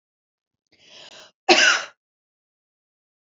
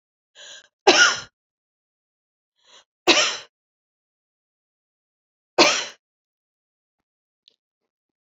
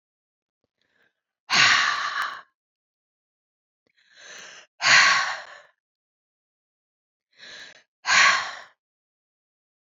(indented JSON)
{
  "cough_length": "3.2 s",
  "cough_amplitude": 28754,
  "cough_signal_mean_std_ratio": 0.26,
  "three_cough_length": "8.4 s",
  "three_cough_amplitude": 32767,
  "three_cough_signal_mean_std_ratio": 0.23,
  "exhalation_length": "10.0 s",
  "exhalation_amplitude": 22805,
  "exhalation_signal_mean_std_ratio": 0.33,
  "survey_phase": "beta (2021-08-13 to 2022-03-07)",
  "age": "45-64",
  "gender": "Female",
  "wearing_mask": "No",
  "symptom_none": true,
  "symptom_onset": "12 days",
  "smoker_status": "Never smoked",
  "respiratory_condition_asthma": false,
  "respiratory_condition_other": false,
  "recruitment_source": "REACT",
  "submission_delay": "1 day",
  "covid_test_result": "Negative",
  "covid_test_method": "RT-qPCR",
  "influenza_a_test_result": "Negative",
  "influenza_b_test_result": "Negative"
}